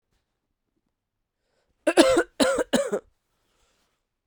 {"three_cough_length": "4.3 s", "three_cough_amplitude": 29535, "three_cough_signal_mean_std_ratio": 0.33, "survey_phase": "beta (2021-08-13 to 2022-03-07)", "age": "18-44", "gender": "Female", "wearing_mask": "No", "symptom_cough_any": true, "symptom_runny_or_blocked_nose": true, "symptom_abdominal_pain": true, "symptom_fever_high_temperature": true, "symptom_headache": true, "symptom_other": true, "smoker_status": "Never smoked", "respiratory_condition_asthma": false, "respiratory_condition_other": false, "recruitment_source": "Test and Trace", "submission_delay": "1 day", "covid_test_result": "Positive", "covid_test_method": "LFT"}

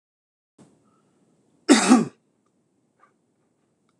{"cough_length": "4.0 s", "cough_amplitude": 25947, "cough_signal_mean_std_ratio": 0.23, "survey_phase": "beta (2021-08-13 to 2022-03-07)", "age": "45-64", "gender": "Male", "wearing_mask": "No", "symptom_sore_throat": true, "symptom_onset": "2 days", "smoker_status": "Ex-smoker", "respiratory_condition_asthma": false, "respiratory_condition_other": false, "recruitment_source": "REACT", "submission_delay": "1 day", "covid_test_result": "Negative", "covid_test_method": "RT-qPCR"}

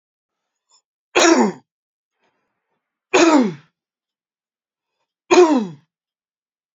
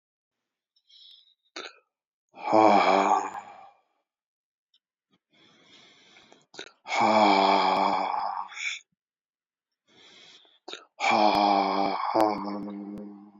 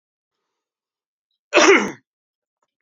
{"three_cough_length": "6.7 s", "three_cough_amplitude": 28776, "three_cough_signal_mean_std_ratio": 0.32, "exhalation_length": "13.4 s", "exhalation_amplitude": 16336, "exhalation_signal_mean_std_ratio": 0.46, "cough_length": "2.8 s", "cough_amplitude": 32125, "cough_signal_mean_std_ratio": 0.27, "survey_phase": "beta (2021-08-13 to 2022-03-07)", "age": "45-64", "gender": "Male", "wearing_mask": "No", "symptom_runny_or_blocked_nose": true, "smoker_status": "Ex-smoker", "respiratory_condition_asthma": false, "respiratory_condition_other": false, "recruitment_source": "REACT", "submission_delay": "2 days", "covid_test_result": "Negative", "covid_test_method": "RT-qPCR", "influenza_a_test_result": "Negative", "influenza_b_test_result": "Negative"}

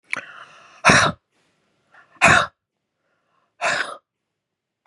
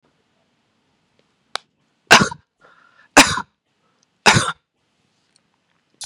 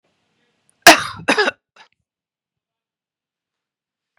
{"exhalation_length": "4.9 s", "exhalation_amplitude": 32707, "exhalation_signal_mean_std_ratio": 0.31, "three_cough_length": "6.1 s", "three_cough_amplitude": 32768, "three_cough_signal_mean_std_ratio": 0.22, "cough_length": "4.2 s", "cough_amplitude": 32768, "cough_signal_mean_std_ratio": 0.2, "survey_phase": "beta (2021-08-13 to 2022-03-07)", "age": "45-64", "gender": "Female", "wearing_mask": "No", "symptom_none": true, "smoker_status": "Ex-smoker", "respiratory_condition_asthma": false, "respiratory_condition_other": false, "recruitment_source": "REACT", "submission_delay": "1 day", "covid_test_result": "Negative", "covid_test_method": "RT-qPCR", "influenza_a_test_result": "Negative", "influenza_b_test_result": "Negative"}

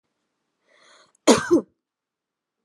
{"cough_length": "2.6 s", "cough_amplitude": 30594, "cough_signal_mean_std_ratio": 0.24, "survey_phase": "alpha (2021-03-01 to 2021-08-12)", "age": "18-44", "gender": "Female", "wearing_mask": "No", "symptom_shortness_of_breath": true, "smoker_status": "Never smoked", "respiratory_condition_asthma": false, "respiratory_condition_other": false, "recruitment_source": "REACT", "submission_delay": "1 day", "covid_test_result": "Negative", "covid_test_method": "RT-qPCR"}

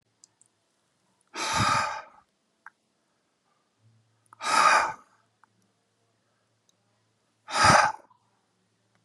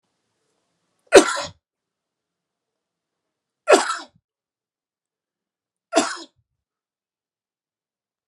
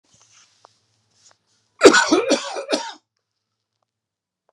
{"exhalation_length": "9.0 s", "exhalation_amplitude": 15764, "exhalation_signal_mean_std_ratio": 0.31, "three_cough_length": "8.3 s", "three_cough_amplitude": 32768, "three_cough_signal_mean_std_ratio": 0.18, "cough_length": "4.5 s", "cough_amplitude": 32768, "cough_signal_mean_std_ratio": 0.28, "survey_phase": "beta (2021-08-13 to 2022-03-07)", "age": "45-64", "gender": "Male", "wearing_mask": "No", "symptom_none": true, "smoker_status": "Ex-smoker", "respiratory_condition_asthma": false, "respiratory_condition_other": false, "recruitment_source": "REACT", "submission_delay": "1 day", "covid_test_result": "Negative", "covid_test_method": "RT-qPCR"}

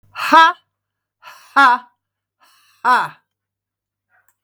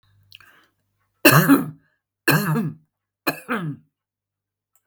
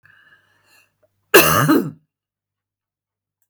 {"exhalation_length": "4.4 s", "exhalation_amplitude": 32768, "exhalation_signal_mean_std_ratio": 0.32, "three_cough_length": "4.9 s", "three_cough_amplitude": 32768, "three_cough_signal_mean_std_ratio": 0.35, "cough_length": "3.5 s", "cough_amplitude": 32768, "cough_signal_mean_std_ratio": 0.3, "survey_phase": "beta (2021-08-13 to 2022-03-07)", "age": "65+", "gender": "Female", "wearing_mask": "No", "symptom_runny_or_blocked_nose": true, "symptom_shortness_of_breath": true, "symptom_onset": "12 days", "smoker_status": "Ex-smoker", "respiratory_condition_asthma": false, "respiratory_condition_other": true, "recruitment_source": "REACT", "submission_delay": "5 days", "covid_test_result": "Negative", "covid_test_method": "RT-qPCR", "influenza_a_test_result": "Negative", "influenza_b_test_result": "Negative"}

